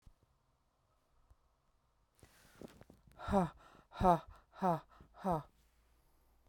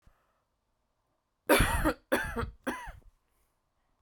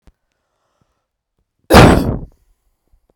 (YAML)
exhalation_length: 6.5 s
exhalation_amplitude: 4979
exhalation_signal_mean_std_ratio: 0.28
three_cough_length: 4.0 s
three_cough_amplitude: 11131
three_cough_signal_mean_std_ratio: 0.36
cough_length: 3.2 s
cough_amplitude: 32768
cough_signal_mean_std_ratio: 0.29
survey_phase: beta (2021-08-13 to 2022-03-07)
age: 45-64
gender: Female
wearing_mask: 'No'
symptom_cough_any: true
symptom_shortness_of_breath: true
symptom_sore_throat: true
symptom_fatigue: true
symptom_headache: true
symptom_onset: 3 days
smoker_status: Ex-smoker
respiratory_condition_asthma: false
respiratory_condition_other: false
recruitment_source: Test and Trace
submission_delay: 2 days
covid_test_result: Positive
covid_test_method: RT-qPCR